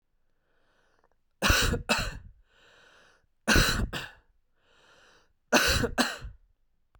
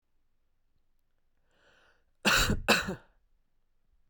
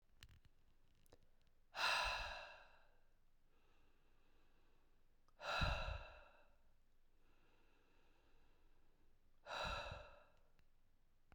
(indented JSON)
{
  "three_cough_length": "7.0 s",
  "three_cough_amplitude": 14940,
  "three_cough_signal_mean_std_ratio": 0.4,
  "cough_length": "4.1 s",
  "cough_amplitude": 9586,
  "cough_signal_mean_std_ratio": 0.31,
  "exhalation_length": "11.3 s",
  "exhalation_amplitude": 1481,
  "exhalation_signal_mean_std_ratio": 0.41,
  "survey_phase": "beta (2021-08-13 to 2022-03-07)",
  "age": "18-44",
  "gender": "Male",
  "wearing_mask": "No",
  "symptom_cough_any": true,
  "smoker_status": "Ex-smoker",
  "respiratory_condition_asthma": false,
  "respiratory_condition_other": false,
  "recruitment_source": "REACT",
  "submission_delay": "4 days",
  "covid_test_result": "Negative",
  "covid_test_method": "RT-qPCR"
}